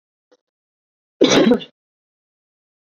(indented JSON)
{
  "cough_length": "2.9 s",
  "cough_amplitude": 29472,
  "cough_signal_mean_std_ratio": 0.29,
  "survey_phase": "beta (2021-08-13 to 2022-03-07)",
  "age": "18-44",
  "gender": "Female",
  "wearing_mask": "No",
  "symptom_fatigue": true,
  "symptom_onset": "12 days",
  "smoker_status": "Current smoker (e-cigarettes or vapes only)",
  "respiratory_condition_asthma": true,
  "respiratory_condition_other": false,
  "recruitment_source": "REACT",
  "submission_delay": "5 days",
  "covid_test_result": "Negative",
  "covid_test_method": "RT-qPCR"
}